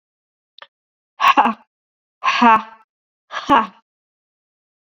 exhalation_length: 4.9 s
exhalation_amplitude: 30162
exhalation_signal_mean_std_ratio: 0.32
survey_phase: beta (2021-08-13 to 2022-03-07)
age: 45-64
gender: Female
wearing_mask: 'No'
symptom_runny_or_blocked_nose: true
symptom_fatigue: true
symptom_fever_high_temperature: true
symptom_headache: true
smoker_status: Never smoked
respiratory_condition_asthma: false
respiratory_condition_other: false
recruitment_source: Test and Trace
submission_delay: 2 days
covid_test_result: Positive
covid_test_method: LFT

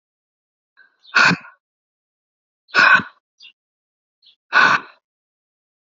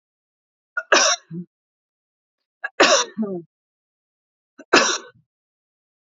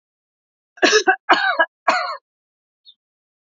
exhalation_length: 5.8 s
exhalation_amplitude: 31725
exhalation_signal_mean_std_ratio: 0.29
three_cough_length: 6.1 s
three_cough_amplitude: 31797
three_cough_signal_mean_std_ratio: 0.31
cough_length: 3.6 s
cough_amplitude: 29264
cough_signal_mean_std_ratio: 0.37
survey_phase: alpha (2021-03-01 to 2021-08-12)
age: 18-44
gender: Female
wearing_mask: 'No'
symptom_none: true
smoker_status: Never smoked
respiratory_condition_asthma: false
respiratory_condition_other: false
recruitment_source: REACT
submission_delay: 2 days
covid_test_result: Negative
covid_test_method: RT-qPCR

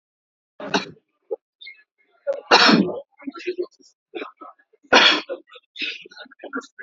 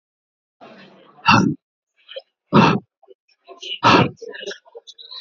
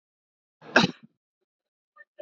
three_cough_length: 6.8 s
three_cough_amplitude: 30569
three_cough_signal_mean_std_ratio: 0.35
exhalation_length: 5.2 s
exhalation_amplitude: 29475
exhalation_signal_mean_std_ratio: 0.35
cough_length: 2.2 s
cough_amplitude: 19650
cough_signal_mean_std_ratio: 0.19
survey_phase: beta (2021-08-13 to 2022-03-07)
age: 45-64
gender: Male
wearing_mask: 'No'
symptom_fatigue: true
symptom_onset: 12 days
smoker_status: Never smoked
respiratory_condition_asthma: false
respiratory_condition_other: false
recruitment_source: REACT
submission_delay: 2 days
covid_test_result: Negative
covid_test_method: RT-qPCR
influenza_a_test_result: Negative
influenza_b_test_result: Negative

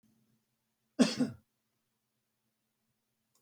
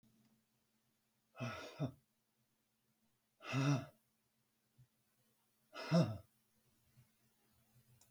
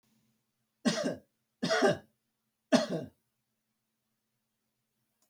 cough_length: 3.4 s
cough_amplitude: 8314
cough_signal_mean_std_ratio: 0.2
exhalation_length: 8.1 s
exhalation_amplitude: 2459
exhalation_signal_mean_std_ratio: 0.28
three_cough_length: 5.3 s
three_cough_amplitude: 10793
three_cough_signal_mean_std_ratio: 0.31
survey_phase: beta (2021-08-13 to 2022-03-07)
age: 65+
gender: Male
wearing_mask: 'No'
symptom_none: true
smoker_status: Never smoked
respiratory_condition_asthma: false
respiratory_condition_other: false
recruitment_source: REACT
submission_delay: 1 day
covid_test_result: Negative
covid_test_method: RT-qPCR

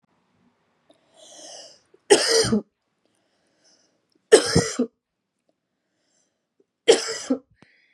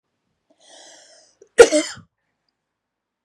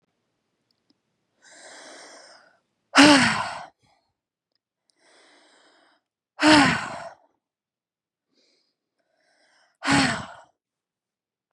three_cough_length: 7.9 s
three_cough_amplitude: 32567
three_cough_signal_mean_std_ratio: 0.28
cough_length: 3.2 s
cough_amplitude: 32768
cough_signal_mean_std_ratio: 0.18
exhalation_length: 11.5 s
exhalation_amplitude: 29374
exhalation_signal_mean_std_ratio: 0.26
survey_phase: beta (2021-08-13 to 2022-03-07)
age: 18-44
gender: Female
wearing_mask: 'No'
symptom_none: true
smoker_status: Never smoked
respiratory_condition_asthma: false
respiratory_condition_other: false
recruitment_source: REACT
submission_delay: 2 days
covid_test_result: Negative
covid_test_method: RT-qPCR
influenza_a_test_result: Negative
influenza_b_test_result: Negative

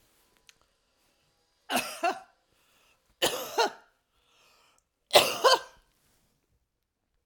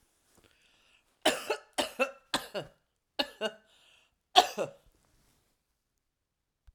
three_cough_length: 7.3 s
three_cough_amplitude: 20359
three_cough_signal_mean_std_ratio: 0.27
cough_length: 6.7 s
cough_amplitude: 24275
cough_signal_mean_std_ratio: 0.25
survey_phase: alpha (2021-03-01 to 2021-08-12)
age: 65+
gender: Female
wearing_mask: 'No'
symptom_none: true
smoker_status: Current smoker (1 to 10 cigarettes per day)
respiratory_condition_asthma: false
respiratory_condition_other: false
recruitment_source: REACT
submission_delay: 1 day
covid_test_result: Negative
covid_test_method: RT-qPCR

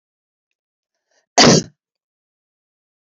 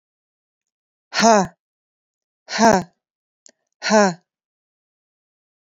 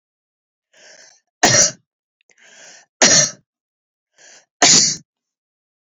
cough_length: 3.1 s
cough_amplitude: 32768
cough_signal_mean_std_ratio: 0.23
exhalation_length: 5.7 s
exhalation_amplitude: 30663
exhalation_signal_mean_std_ratio: 0.29
three_cough_length: 5.9 s
three_cough_amplitude: 32767
three_cough_signal_mean_std_ratio: 0.32
survey_phase: beta (2021-08-13 to 2022-03-07)
age: 45-64
gender: Female
wearing_mask: 'No'
symptom_none: true
smoker_status: Ex-smoker
respiratory_condition_asthma: false
respiratory_condition_other: false
recruitment_source: REACT
submission_delay: 2 days
covid_test_result: Negative
covid_test_method: RT-qPCR
influenza_a_test_result: Negative
influenza_b_test_result: Negative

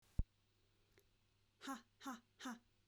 exhalation_length: 2.9 s
exhalation_amplitude: 2014
exhalation_signal_mean_std_ratio: 0.28
survey_phase: beta (2021-08-13 to 2022-03-07)
age: 18-44
gender: Female
wearing_mask: 'No'
symptom_none: true
smoker_status: Never smoked
respiratory_condition_asthma: false
respiratory_condition_other: false
recruitment_source: REACT
submission_delay: 1 day
covid_test_result: Negative
covid_test_method: RT-qPCR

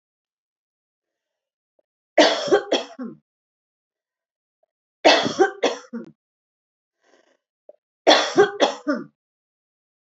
three_cough_length: 10.2 s
three_cough_amplitude: 30074
three_cough_signal_mean_std_ratio: 0.3
survey_phase: beta (2021-08-13 to 2022-03-07)
age: 45-64
gender: Female
wearing_mask: 'No'
symptom_none: true
smoker_status: Never smoked
respiratory_condition_asthma: false
respiratory_condition_other: false
recruitment_source: REACT
submission_delay: 1 day
covid_test_result: Negative
covid_test_method: RT-qPCR
influenza_a_test_result: Negative
influenza_b_test_result: Negative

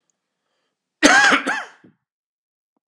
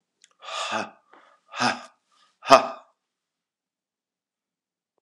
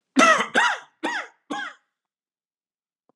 cough_length: 2.9 s
cough_amplitude: 32768
cough_signal_mean_std_ratio: 0.34
exhalation_length: 5.0 s
exhalation_amplitude: 32768
exhalation_signal_mean_std_ratio: 0.22
three_cough_length: 3.2 s
three_cough_amplitude: 27398
three_cough_signal_mean_std_ratio: 0.39
survey_phase: beta (2021-08-13 to 2022-03-07)
age: 45-64
gender: Male
wearing_mask: 'No'
symptom_cough_any: true
symptom_fatigue: true
symptom_headache: true
symptom_onset: 3 days
smoker_status: Never smoked
respiratory_condition_asthma: false
respiratory_condition_other: false
recruitment_source: Test and Trace
submission_delay: 2 days
covid_test_result: Positive
covid_test_method: ePCR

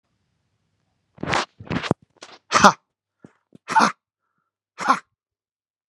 exhalation_length: 5.9 s
exhalation_amplitude: 32768
exhalation_signal_mean_std_ratio: 0.26
survey_phase: beta (2021-08-13 to 2022-03-07)
age: 45-64
gender: Male
wearing_mask: 'No'
symptom_none: true
smoker_status: Never smoked
recruitment_source: REACT
submission_delay: 1 day
covid_test_result: Negative
covid_test_method: RT-qPCR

